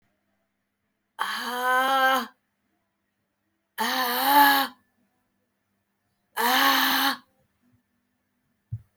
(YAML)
exhalation_length: 9.0 s
exhalation_amplitude: 20089
exhalation_signal_mean_std_ratio: 0.44
survey_phase: alpha (2021-03-01 to 2021-08-12)
age: 18-44
gender: Female
wearing_mask: 'No'
symptom_none: true
symptom_onset: 12 days
smoker_status: Never smoked
respiratory_condition_asthma: false
respiratory_condition_other: false
recruitment_source: REACT
submission_delay: 2 days
covid_test_result: Negative
covid_test_method: RT-qPCR